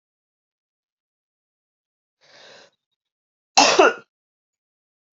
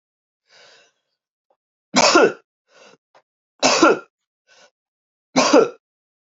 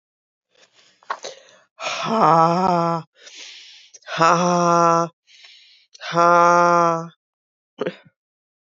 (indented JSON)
{
  "cough_length": "5.1 s",
  "cough_amplitude": 32767,
  "cough_signal_mean_std_ratio": 0.2,
  "three_cough_length": "6.4 s",
  "three_cough_amplitude": 28196,
  "three_cough_signal_mean_std_ratio": 0.32,
  "exhalation_length": "8.8 s",
  "exhalation_amplitude": 28497,
  "exhalation_signal_mean_std_ratio": 0.42,
  "survey_phase": "beta (2021-08-13 to 2022-03-07)",
  "age": "18-44",
  "gender": "Female",
  "wearing_mask": "No",
  "symptom_cough_any": true,
  "symptom_runny_or_blocked_nose": true,
  "symptom_sore_throat": true,
  "symptom_fatigue": true,
  "symptom_fever_high_temperature": true,
  "symptom_headache": true,
  "symptom_other": true,
  "symptom_onset": "3 days",
  "smoker_status": "Never smoked",
  "respiratory_condition_asthma": false,
  "respiratory_condition_other": false,
  "recruitment_source": "Test and Trace",
  "submission_delay": "1 day",
  "covid_test_result": "Positive",
  "covid_test_method": "ePCR"
}